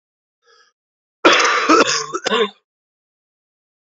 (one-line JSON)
{"cough_length": "3.9 s", "cough_amplitude": 28118, "cough_signal_mean_std_ratio": 0.4, "survey_phase": "beta (2021-08-13 to 2022-03-07)", "age": "18-44", "gender": "Male", "wearing_mask": "No", "symptom_cough_any": true, "symptom_runny_or_blocked_nose": true, "symptom_fatigue": true, "smoker_status": "Never smoked", "respiratory_condition_asthma": false, "respiratory_condition_other": false, "recruitment_source": "Test and Trace", "submission_delay": "0 days", "covid_test_result": "Positive", "covid_test_method": "LFT"}